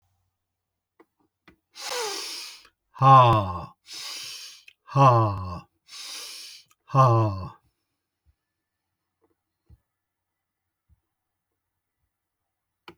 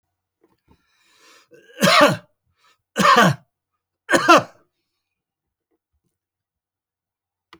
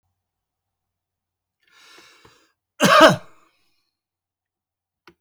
exhalation_length: 13.0 s
exhalation_amplitude: 22776
exhalation_signal_mean_std_ratio: 0.3
three_cough_length: 7.6 s
three_cough_amplitude: 31161
three_cough_signal_mean_std_ratio: 0.29
cough_length: 5.2 s
cough_amplitude: 31740
cough_signal_mean_std_ratio: 0.21
survey_phase: beta (2021-08-13 to 2022-03-07)
age: 65+
gender: Male
wearing_mask: 'No'
symptom_none: true
smoker_status: Never smoked
respiratory_condition_asthma: false
respiratory_condition_other: false
recruitment_source: REACT
submission_delay: 1 day
covid_test_result: Negative
covid_test_method: RT-qPCR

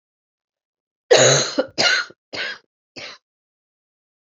cough_length: 4.4 s
cough_amplitude: 30988
cough_signal_mean_std_ratio: 0.35
survey_phase: beta (2021-08-13 to 2022-03-07)
age: 45-64
gender: Female
wearing_mask: 'No'
symptom_cough_any: true
symptom_runny_or_blocked_nose: true
symptom_shortness_of_breath: true
symptom_sore_throat: true
symptom_fatigue: true
symptom_headache: true
symptom_onset: 4 days
smoker_status: Never smoked
respiratory_condition_asthma: false
respiratory_condition_other: false
recruitment_source: Test and Trace
submission_delay: 2 days
covid_test_result: Positive
covid_test_method: RT-qPCR
covid_ct_value: 15.9
covid_ct_gene: ORF1ab gene
covid_ct_mean: 16.5
covid_viral_load: 4000000 copies/ml
covid_viral_load_category: High viral load (>1M copies/ml)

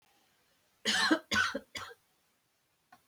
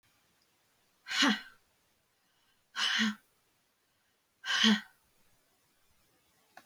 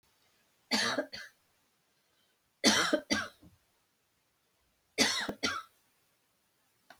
cough_length: 3.1 s
cough_amplitude: 6579
cough_signal_mean_std_ratio: 0.38
exhalation_length: 6.7 s
exhalation_amplitude: 9722
exhalation_signal_mean_std_ratio: 0.31
three_cough_length: 7.0 s
three_cough_amplitude: 10854
three_cough_signal_mean_std_ratio: 0.34
survey_phase: beta (2021-08-13 to 2022-03-07)
age: 45-64
gender: Female
wearing_mask: 'No'
symptom_none: true
smoker_status: Never smoked
respiratory_condition_asthma: true
respiratory_condition_other: false
recruitment_source: REACT
submission_delay: 2 days
covid_test_result: Negative
covid_test_method: RT-qPCR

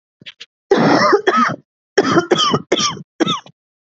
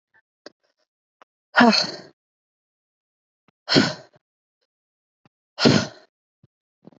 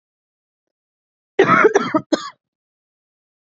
three_cough_length: 3.9 s
three_cough_amplitude: 28062
three_cough_signal_mean_std_ratio: 0.58
exhalation_length: 7.0 s
exhalation_amplitude: 28256
exhalation_signal_mean_std_ratio: 0.25
cough_length: 3.6 s
cough_amplitude: 32768
cough_signal_mean_std_ratio: 0.31
survey_phase: beta (2021-08-13 to 2022-03-07)
age: 18-44
gender: Female
wearing_mask: 'No'
symptom_none: true
smoker_status: Never smoked
respiratory_condition_asthma: true
respiratory_condition_other: false
recruitment_source: REACT
submission_delay: 6 days
covid_test_result: Negative
covid_test_method: RT-qPCR
influenza_a_test_result: Negative
influenza_b_test_result: Negative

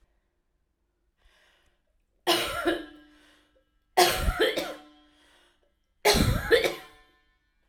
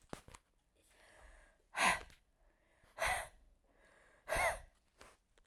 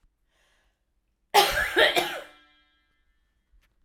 three_cough_length: 7.7 s
three_cough_amplitude: 19564
three_cough_signal_mean_std_ratio: 0.38
exhalation_length: 5.5 s
exhalation_amplitude: 4249
exhalation_signal_mean_std_ratio: 0.33
cough_length: 3.8 s
cough_amplitude: 19373
cough_signal_mean_std_ratio: 0.33
survey_phase: alpha (2021-03-01 to 2021-08-12)
age: 45-64
gender: Female
wearing_mask: 'No'
symptom_fatigue: true
symptom_fever_high_temperature: true
symptom_headache: true
symptom_change_to_sense_of_smell_or_taste: true
smoker_status: Ex-smoker
respiratory_condition_asthma: false
respiratory_condition_other: false
recruitment_source: Test and Trace
submission_delay: 2 days
covid_test_result: Positive
covid_test_method: RT-qPCR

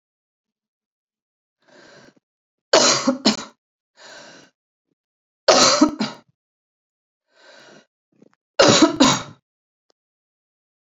three_cough_length: 10.8 s
three_cough_amplitude: 31930
three_cough_signal_mean_std_ratio: 0.3
survey_phase: beta (2021-08-13 to 2022-03-07)
age: 18-44
gender: Female
wearing_mask: 'No'
symptom_cough_any: true
symptom_new_continuous_cough: true
symptom_runny_or_blocked_nose: true
symptom_fatigue: true
symptom_fever_high_temperature: true
symptom_headache: true
symptom_change_to_sense_of_smell_or_taste: true
smoker_status: Never smoked
respiratory_condition_asthma: false
respiratory_condition_other: false
recruitment_source: Test and Trace
submission_delay: 2 days
covid_test_result: Positive
covid_test_method: RT-qPCR
covid_ct_value: 18.9
covid_ct_gene: N gene
covid_ct_mean: 20.0
covid_viral_load: 280000 copies/ml
covid_viral_load_category: Low viral load (10K-1M copies/ml)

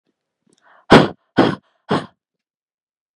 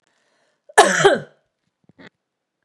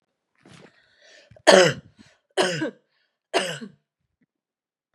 exhalation_length: 3.2 s
exhalation_amplitude: 32768
exhalation_signal_mean_std_ratio: 0.27
cough_length: 2.6 s
cough_amplitude: 32768
cough_signal_mean_std_ratio: 0.29
three_cough_length: 4.9 s
three_cough_amplitude: 32768
three_cough_signal_mean_std_ratio: 0.27
survey_phase: beta (2021-08-13 to 2022-03-07)
age: 18-44
gender: Female
wearing_mask: 'No'
symptom_none: true
symptom_onset: 2 days
smoker_status: Ex-smoker
respiratory_condition_asthma: true
respiratory_condition_other: false
recruitment_source: Test and Trace
submission_delay: 2 days
covid_test_result: Positive
covid_test_method: RT-qPCR
covid_ct_value: 23.1
covid_ct_gene: ORF1ab gene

